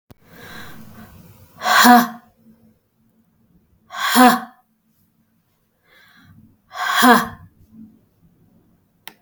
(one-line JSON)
{"exhalation_length": "9.2 s", "exhalation_amplitude": 32768, "exhalation_signal_mean_std_ratio": 0.31, "survey_phase": "beta (2021-08-13 to 2022-03-07)", "age": "45-64", "gender": "Female", "wearing_mask": "No", "symptom_none": true, "smoker_status": "Never smoked", "respiratory_condition_asthma": false, "respiratory_condition_other": false, "recruitment_source": "REACT", "submission_delay": "2 days", "covid_test_result": "Negative", "covid_test_method": "RT-qPCR", "influenza_a_test_result": "Negative", "influenza_b_test_result": "Negative"}